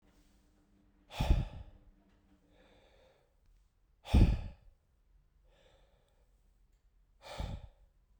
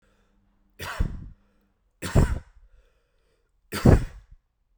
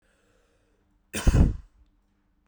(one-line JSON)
{"exhalation_length": "8.2 s", "exhalation_amplitude": 7080, "exhalation_signal_mean_std_ratio": 0.25, "three_cough_length": "4.8 s", "three_cough_amplitude": 26441, "three_cough_signal_mean_std_ratio": 0.29, "cough_length": "2.5 s", "cough_amplitude": 16555, "cough_signal_mean_std_ratio": 0.28, "survey_phase": "beta (2021-08-13 to 2022-03-07)", "age": "18-44", "gender": "Male", "wearing_mask": "No", "symptom_none": true, "smoker_status": "Never smoked", "respiratory_condition_asthma": false, "respiratory_condition_other": false, "recruitment_source": "REACT", "submission_delay": "1 day", "covid_test_result": "Negative", "covid_test_method": "RT-qPCR"}